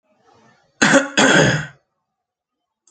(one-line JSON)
{"cough_length": "2.9 s", "cough_amplitude": 29712, "cough_signal_mean_std_ratio": 0.41, "survey_phase": "beta (2021-08-13 to 2022-03-07)", "age": "18-44", "gender": "Male", "wearing_mask": "No", "symptom_none": true, "smoker_status": "Never smoked", "respiratory_condition_asthma": true, "respiratory_condition_other": false, "recruitment_source": "Test and Trace", "submission_delay": "0 days", "covid_test_result": "Negative", "covid_test_method": "LAMP"}